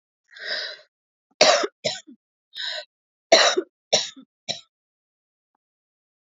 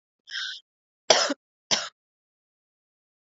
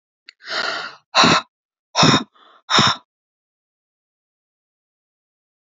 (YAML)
three_cough_length: 6.2 s
three_cough_amplitude: 28894
three_cough_signal_mean_std_ratio: 0.31
cough_length: 3.2 s
cough_amplitude: 29180
cough_signal_mean_std_ratio: 0.27
exhalation_length: 5.6 s
exhalation_amplitude: 32674
exhalation_signal_mean_std_ratio: 0.34
survey_phase: beta (2021-08-13 to 2022-03-07)
age: 18-44
gender: Female
wearing_mask: 'No'
symptom_cough_any: true
symptom_new_continuous_cough: true
symptom_sore_throat: true
symptom_fatigue: true
symptom_headache: true
symptom_change_to_sense_of_smell_or_taste: true
symptom_other: true
symptom_onset: 2 days
smoker_status: Never smoked
respiratory_condition_asthma: false
respiratory_condition_other: false
recruitment_source: Test and Trace
submission_delay: 0 days
covid_test_result: Positive
covid_test_method: RT-qPCR
covid_ct_value: 25.5
covid_ct_gene: N gene